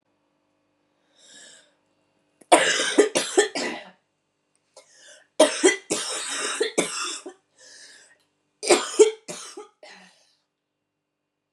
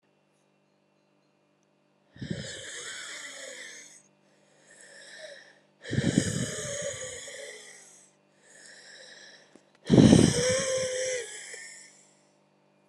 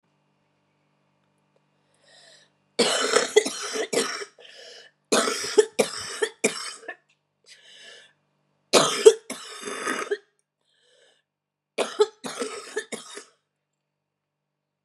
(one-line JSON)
{"three_cough_length": "11.5 s", "three_cough_amplitude": 27470, "three_cough_signal_mean_std_ratio": 0.34, "exhalation_length": "12.9 s", "exhalation_amplitude": 22786, "exhalation_signal_mean_std_ratio": 0.34, "cough_length": "14.8 s", "cough_amplitude": 32125, "cough_signal_mean_std_ratio": 0.32, "survey_phase": "alpha (2021-03-01 to 2021-08-12)", "age": "18-44", "gender": "Female", "wearing_mask": "No", "symptom_cough_any": true, "symptom_new_continuous_cough": true, "symptom_shortness_of_breath": true, "symptom_diarrhoea": true, "symptom_fatigue": true, "symptom_headache": true, "symptom_change_to_sense_of_smell_or_taste": true, "symptom_loss_of_taste": true, "smoker_status": "Current smoker (e-cigarettes or vapes only)", "respiratory_condition_asthma": true, "respiratory_condition_other": false, "recruitment_source": "Test and Trace", "submission_delay": "1 day", "covid_test_result": "Positive", "covid_test_method": "RT-qPCR", "covid_ct_value": 17.5, "covid_ct_gene": "ORF1ab gene", "covid_ct_mean": 18.2, "covid_viral_load": "1100000 copies/ml", "covid_viral_load_category": "High viral load (>1M copies/ml)"}